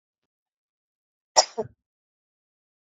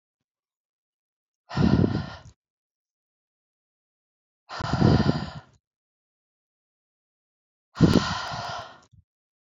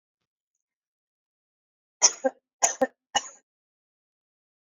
{"cough_length": "2.8 s", "cough_amplitude": 25708, "cough_signal_mean_std_ratio": 0.14, "exhalation_length": "9.6 s", "exhalation_amplitude": 21484, "exhalation_signal_mean_std_ratio": 0.31, "three_cough_length": "4.7 s", "three_cough_amplitude": 26468, "three_cough_signal_mean_std_ratio": 0.19, "survey_phase": "beta (2021-08-13 to 2022-03-07)", "age": "18-44", "gender": "Female", "wearing_mask": "No", "symptom_sore_throat": true, "symptom_abdominal_pain": true, "smoker_status": "Current smoker (11 or more cigarettes per day)", "respiratory_condition_asthma": false, "respiratory_condition_other": false, "recruitment_source": "Test and Trace", "submission_delay": "2 days", "covid_test_result": "Positive", "covid_test_method": "RT-qPCR", "covid_ct_value": 19.9, "covid_ct_gene": "N gene"}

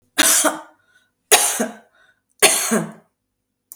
{"three_cough_length": "3.8 s", "three_cough_amplitude": 32768, "three_cough_signal_mean_std_ratio": 0.43, "survey_phase": "beta (2021-08-13 to 2022-03-07)", "age": "65+", "gender": "Female", "wearing_mask": "No", "symptom_none": true, "smoker_status": "Never smoked", "respiratory_condition_asthma": false, "respiratory_condition_other": false, "recruitment_source": "REACT", "submission_delay": "2 days", "covid_test_result": "Negative", "covid_test_method": "RT-qPCR", "influenza_a_test_result": "Negative", "influenza_b_test_result": "Negative"}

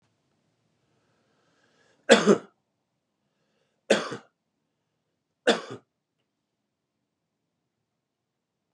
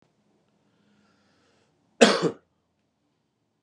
{"three_cough_length": "8.7 s", "three_cough_amplitude": 29505, "three_cough_signal_mean_std_ratio": 0.18, "cough_length": "3.6 s", "cough_amplitude": 28357, "cough_signal_mean_std_ratio": 0.19, "survey_phase": "beta (2021-08-13 to 2022-03-07)", "age": "45-64", "gender": "Male", "wearing_mask": "No", "symptom_none": true, "smoker_status": "Never smoked", "respiratory_condition_asthma": false, "respiratory_condition_other": false, "recruitment_source": "REACT", "submission_delay": "1 day", "covid_test_result": "Negative", "covid_test_method": "RT-qPCR", "influenza_a_test_result": "Negative", "influenza_b_test_result": "Negative"}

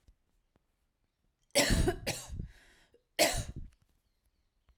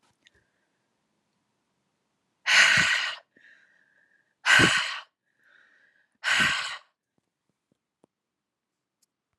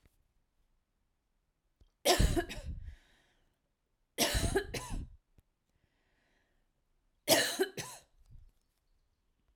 {"cough_length": "4.8 s", "cough_amplitude": 7651, "cough_signal_mean_std_ratio": 0.36, "exhalation_length": "9.4 s", "exhalation_amplitude": 16339, "exhalation_signal_mean_std_ratio": 0.32, "three_cough_length": "9.6 s", "three_cough_amplitude": 10038, "three_cough_signal_mean_std_ratio": 0.33, "survey_phase": "alpha (2021-03-01 to 2021-08-12)", "age": "45-64", "gender": "Female", "wearing_mask": "No", "symptom_none": true, "smoker_status": "Never smoked", "respiratory_condition_asthma": false, "respiratory_condition_other": false, "recruitment_source": "REACT", "submission_delay": "3 days", "covid_test_result": "Negative", "covid_test_method": "RT-qPCR"}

